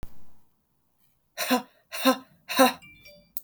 exhalation_length: 3.4 s
exhalation_amplitude: 18636
exhalation_signal_mean_std_ratio: 0.37
survey_phase: beta (2021-08-13 to 2022-03-07)
age: 18-44
gender: Female
wearing_mask: 'No'
symptom_cough_any: true
symptom_new_continuous_cough: true
symptom_runny_or_blocked_nose: true
symptom_shortness_of_breath: true
symptom_onset: 5 days
smoker_status: Never smoked
respiratory_condition_asthma: true
respiratory_condition_other: false
recruitment_source: Test and Trace
submission_delay: 2 days
covid_test_result: Positive
covid_test_method: RT-qPCR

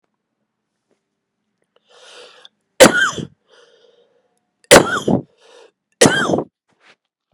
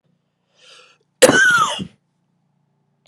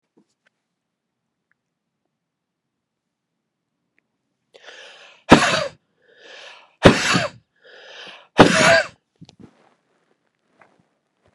three_cough_length: 7.3 s
three_cough_amplitude: 32768
three_cough_signal_mean_std_ratio: 0.28
cough_length: 3.1 s
cough_amplitude: 32768
cough_signal_mean_std_ratio: 0.34
exhalation_length: 11.3 s
exhalation_amplitude: 32768
exhalation_signal_mean_std_ratio: 0.24
survey_phase: beta (2021-08-13 to 2022-03-07)
age: 45-64
gender: Male
wearing_mask: 'No'
symptom_cough_any: true
symptom_shortness_of_breath: true
symptom_fatigue: true
symptom_headache: true
symptom_change_to_sense_of_smell_or_taste: true
symptom_onset: 7 days
smoker_status: Never smoked
respiratory_condition_asthma: false
respiratory_condition_other: false
recruitment_source: Test and Trace
submission_delay: 2 days
covid_test_result: Positive
covid_test_method: RT-qPCR
covid_ct_value: 24.4
covid_ct_gene: ORF1ab gene
covid_ct_mean: 24.9
covid_viral_load: 6600 copies/ml
covid_viral_load_category: Minimal viral load (< 10K copies/ml)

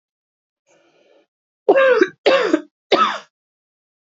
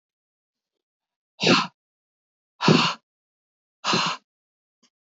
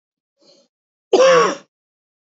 three_cough_length: 4.1 s
three_cough_amplitude: 26436
three_cough_signal_mean_std_ratio: 0.39
exhalation_length: 5.1 s
exhalation_amplitude: 20591
exhalation_signal_mean_std_ratio: 0.31
cough_length: 2.3 s
cough_amplitude: 26377
cough_signal_mean_std_ratio: 0.36
survey_phase: beta (2021-08-13 to 2022-03-07)
age: 18-44
gender: Female
wearing_mask: 'No'
symptom_cough_any: true
symptom_runny_or_blocked_nose: true
symptom_sore_throat: true
smoker_status: Never smoked
respiratory_condition_asthma: false
respiratory_condition_other: false
recruitment_source: Test and Trace
submission_delay: 2 days
covid_test_result: Positive
covid_test_method: RT-qPCR
covid_ct_value: 18.1
covid_ct_gene: ORF1ab gene
covid_ct_mean: 18.3
covid_viral_load: 1000000 copies/ml
covid_viral_load_category: High viral load (>1M copies/ml)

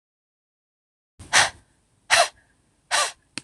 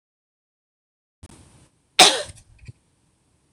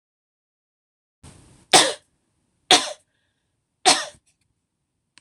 exhalation_length: 3.4 s
exhalation_amplitude: 25753
exhalation_signal_mean_std_ratio: 0.3
cough_length: 3.5 s
cough_amplitude: 26028
cough_signal_mean_std_ratio: 0.18
three_cough_length: 5.2 s
three_cough_amplitude: 26028
three_cough_signal_mean_std_ratio: 0.23
survey_phase: alpha (2021-03-01 to 2021-08-12)
age: 18-44
gender: Female
wearing_mask: 'No'
symptom_fatigue: true
symptom_change_to_sense_of_smell_or_taste: true
symptom_loss_of_taste: true
symptom_onset: 3 days
smoker_status: Never smoked
respiratory_condition_asthma: false
respiratory_condition_other: false
recruitment_source: Test and Trace
submission_delay: 2 days
covid_test_result: Positive
covid_test_method: RT-qPCR
covid_ct_value: 29.4
covid_ct_gene: N gene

